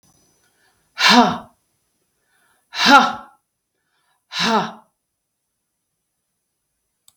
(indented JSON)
{
  "exhalation_length": "7.2 s",
  "exhalation_amplitude": 32768,
  "exhalation_signal_mean_std_ratio": 0.28,
  "survey_phase": "beta (2021-08-13 to 2022-03-07)",
  "age": "65+",
  "gender": "Female",
  "wearing_mask": "No",
  "symptom_none": true,
  "smoker_status": "Never smoked",
  "respiratory_condition_asthma": false,
  "respiratory_condition_other": false,
  "recruitment_source": "REACT",
  "submission_delay": "2 days",
  "covid_test_result": "Negative",
  "covid_test_method": "RT-qPCR",
  "influenza_a_test_result": "Negative",
  "influenza_b_test_result": "Negative"
}